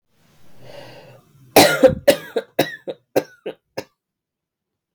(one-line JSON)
{"three_cough_length": "4.9 s", "three_cough_amplitude": 32768, "three_cough_signal_mean_std_ratio": 0.3, "survey_phase": "beta (2021-08-13 to 2022-03-07)", "age": "18-44", "gender": "Female", "wearing_mask": "No", "symptom_runny_or_blocked_nose": true, "symptom_shortness_of_breath": true, "symptom_fatigue": true, "symptom_headache": true, "symptom_onset": "2 days", "smoker_status": "Never smoked", "respiratory_condition_asthma": true, "respiratory_condition_other": false, "recruitment_source": "Test and Trace", "submission_delay": "1 day", "covid_test_result": "Positive", "covid_test_method": "RT-qPCR", "covid_ct_value": 15.8, "covid_ct_gene": "ORF1ab gene", "covid_ct_mean": 16.0, "covid_viral_load": "5700000 copies/ml", "covid_viral_load_category": "High viral load (>1M copies/ml)"}